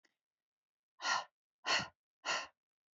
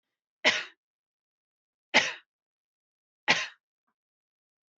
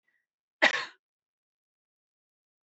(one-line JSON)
{"exhalation_length": "3.0 s", "exhalation_amplitude": 3468, "exhalation_signal_mean_std_ratio": 0.35, "three_cough_length": "4.8 s", "three_cough_amplitude": 16296, "three_cough_signal_mean_std_ratio": 0.23, "cough_length": "2.6 s", "cough_amplitude": 12610, "cough_signal_mean_std_ratio": 0.18, "survey_phase": "beta (2021-08-13 to 2022-03-07)", "age": "45-64", "gender": "Female", "wearing_mask": "No", "symptom_cough_any": true, "symptom_headache": true, "smoker_status": "Ex-smoker", "respiratory_condition_asthma": false, "respiratory_condition_other": false, "recruitment_source": "REACT", "submission_delay": "1 day", "covid_test_result": "Negative", "covid_test_method": "RT-qPCR"}